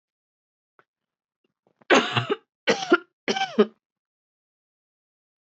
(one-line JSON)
{"three_cough_length": "5.5 s", "three_cough_amplitude": 18498, "three_cough_signal_mean_std_ratio": 0.28, "survey_phase": "beta (2021-08-13 to 2022-03-07)", "age": "18-44", "gender": "Female", "wearing_mask": "No", "symptom_cough_any": true, "symptom_runny_or_blocked_nose": true, "symptom_shortness_of_breath": true, "symptom_sore_throat": true, "symptom_fatigue": true, "symptom_headache": true, "symptom_onset": "6 days", "smoker_status": "Ex-smoker", "respiratory_condition_asthma": false, "respiratory_condition_other": false, "recruitment_source": "Test and Trace", "submission_delay": "1 day", "covid_test_result": "Positive", "covid_test_method": "RT-qPCR", "covid_ct_value": 21.6, "covid_ct_gene": "ORF1ab gene"}